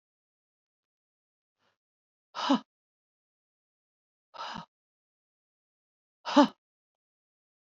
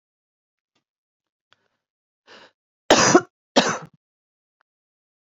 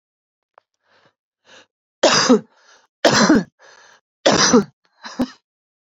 {
  "exhalation_length": "7.7 s",
  "exhalation_amplitude": 15408,
  "exhalation_signal_mean_std_ratio": 0.17,
  "cough_length": "5.2 s",
  "cough_amplitude": 28085,
  "cough_signal_mean_std_ratio": 0.22,
  "three_cough_length": "5.8 s",
  "three_cough_amplitude": 30593,
  "three_cough_signal_mean_std_ratio": 0.37,
  "survey_phase": "beta (2021-08-13 to 2022-03-07)",
  "age": "18-44",
  "gender": "Female",
  "wearing_mask": "No",
  "symptom_fatigue": true,
  "smoker_status": "Current smoker (1 to 10 cigarettes per day)",
  "respiratory_condition_asthma": false,
  "respiratory_condition_other": false,
  "recruitment_source": "REACT",
  "submission_delay": "3 days",
  "covid_test_result": "Negative",
  "covid_test_method": "RT-qPCR",
  "influenza_a_test_result": "Negative",
  "influenza_b_test_result": "Negative"
}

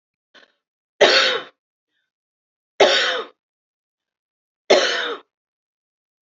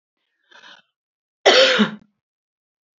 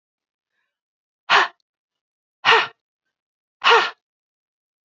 {
  "three_cough_length": "6.2 s",
  "three_cough_amplitude": 30762,
  "three_cough_signal_mean_std_ratio": 0.33,
  "cough_length": "3.0 s",
  "cough_amplitude": 27935,
  "cough_signal_mean_std_ratio": 0.31,
  "exhalation_length": "4.9 s",
  "exhalation_amplitude": 29771,
  "exhalation_signal_mean_std_ratio": 0.27,
  "survey_phase": "beta (2021-08-13 to 2022-03-07)",
  "age": "45-64",
  "gender": "Female",
  "wearing_mask": "No",
  "symptom_runny_or_blocked_nose": true,
  "symptom_fatigue": true,
  "symptom_headache": true,
  "smoker_status": "Never smoked",
  "respiratory_condition_asthma": false,
  "respiratory_condition_other": false,
  "recruitment_source": "Test and Trace",
  "submission_delay": "2 days",
  "covid_test_result": "Positive",
  "covid_test_method": "RT-qPCR",
  "covid_ct_value": 24.1,
  "covid_ct_gene": "ORF1ab gene",
  "covid_ct_mean": 24.8,
  "covid_viral_load": "7600 copies/ml",
  "covid_viral_load_category": "Minimal viral load (< 10K copies/ml)"
}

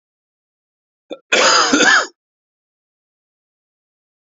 {
  "cough_length": "4.4 s",
  "cough_amplitude": 31785,
  "cough_signal_mean_std_ratio": 0.34,
  "survey_phase": "beta (2021-08-13 to 2022-03-07)",
  "age": "45-64",
  "gender": "Male",
  "wearing_mask": "No",
  "symptom_cough_any": true,
  "symptom_new_continuous_cough": true,
  "symptom_runny_or_blocked_nose": true,
  "symptom_sore_throat": true,
  "symptom_fatigue": true,
  "symptom_fever_high_temperature": true,
  "symptom_headache": true,
  "symptom_change_to_sense_of_smell_or_taste": true,
  "symptom_loss_of_taste": true,
  "symptom_onset": "2 days",
  "smoker_status": "Never smoked",
  "respiratory_condition_asthma": false,
  "respiratory_condition_other": false,
  "recruitment_source": "Test and Trace",
  "submission_delay": "2 days",
  "covid_test_result": "Positive",
  "covid_test_method": "RT-qPCR",
  "covid_ct_value": 14.1,
  "covid_ct_gene": "ORF1ab gene",
  "covid_ct_mean": 14.6,
  "covid_viral_load": "17000000 copies/ml",
  "covid_viral_load_category": "High viral load (>1M copies/ml)"
}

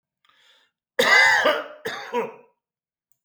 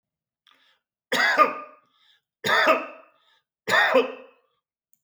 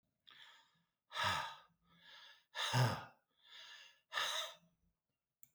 {
  "cough_length": "3.2 s",
  "cough_amplitude": 21610,
  "cough_signal_mean_std_ratio": 0.42,
  "three_cough_length": "5.0 s",
  "three_cough_amplitude": 21554,
  "three_cough_signal_mean_std_ratio": 0.4,
  "exhalation_length": "5.5 s",
  "exhalation_amplitude": 2633,
  "exhalation_signal_mean_std_ratio": 0.4,
  "survey_phase": "beta (2021-08-13 to 2022-03-07)",
  "age": "65+",
  "gender": "Male",
  "wearing_mask": "No",
  "symptom_none": true,
  "smoker_status": "Never smoked",
  "respiratory_condition_asthma": false,
  "respiratory_condition_other": false,
  "recruitment_source": "REACT",
  "submission_delay": "1 day",
  "covid_test_result": "Negative",
  "covid_test_method": "RT-qPCR",
  "influenza_a_test_result": "Negative",
  "influenza_b_test_result": "Negative"
}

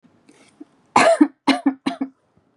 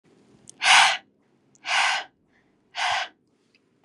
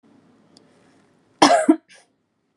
{
  "three_cough_length": "2.6 s",
  "three_cough_amplitude": 32393,
  "three_cough_signal_mean_std_ratio": 0.37,
  "exhalation_length": "3.8 s",
  "exhalation_amplitude": 21940,
  "exhalation_signal_mean_std_ratio": 0.38,
  "cough_length": "2.6 s",
  "cough_amplitude": 32767,
  "cough_signal_mean_std_ratio": 0.27,
  "survey_phase": "beta (2021-08-13 to 2022-03-07)",
  "age": "18-44",
  "gender": "Female",
  "wearing_mask": "No",
  "symptom_none": true,
  "smoker_status": "Never smoked",
  "respiratory_condition_asthma": false,
  "respiratory_condition_other": false,
  "recruitment_source": "REACT",
  "submission_delay": "1 day",
  "covid_test_result": "Negative",
  "covid_test_method": "RT-qPCR"
}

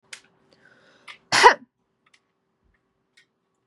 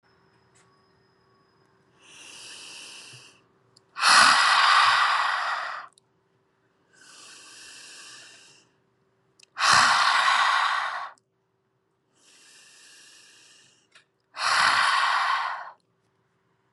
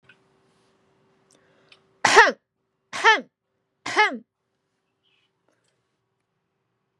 {
  "cough_length": "3.7 s",
  "cough_amplitude": 32767,
  "cough_signal_mean_std_ratio": 0.18,
  "exhalation_length": "16.7 s",
  "exhalation_amplitude": 22657,
  "exhalation_signal_mean_std_ratio": 0.43,
  "three_cough_length": "7.0 s",
  "three_cough_amplitude": 32767,
  "three_cough_signal_mean_std_ratio": 0.23,
  "survey_phase": "beta (2021-08-13 to 2022-03-07)",
  "age": "18-44",
  "gender": "Female",
  "wearing_mask": "Yes",
  "symptom_sore_throat": true,
  "smoker_status": "Never smoked",
  "respiratory_condition_asthma": false,
  "respiratory_condition_other": false,
  "recruitment_source": "Test and Trace",
  "submission_delay": "0 days",
  "covid_test_result": "Negative",
  "covid_test_method": "LFT"
}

